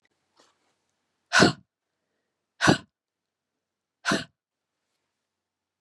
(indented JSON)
{
  "exhalation_length": "5.8 s",
  "exhalation_amplitude": 26930,
  "exhalation_signal_mean_std_ratio": 0.21,
  "survey_phase": "beta (2021-08-13 to 2022-03-07)",
  "age": "45-64",
  "gender": "Female",
  "wearing_mask": "No",
  "symptom_cough_any": true,
  "symptom_runny_or_blocked_nose": true,
  "symptom_abdominal_pain": true,
  "symptom_headache": true,
  "symptom_other": true,
  "symptom_onset": "5 days",
  "smoker_status": "Never smoked",
  "respiratory_condition_asthma": false,
  "respiratory_condition_other": false,
  "recruitment_source": "Test and Trace",
  "submission_delay": "1 day",
  "covid_test_result": "Positive",
  "covid_test_method": "RT-qPCR",
  "covid_ct_value": 27.3,
  "covid_ct_gene": "ORF1ab gene"
}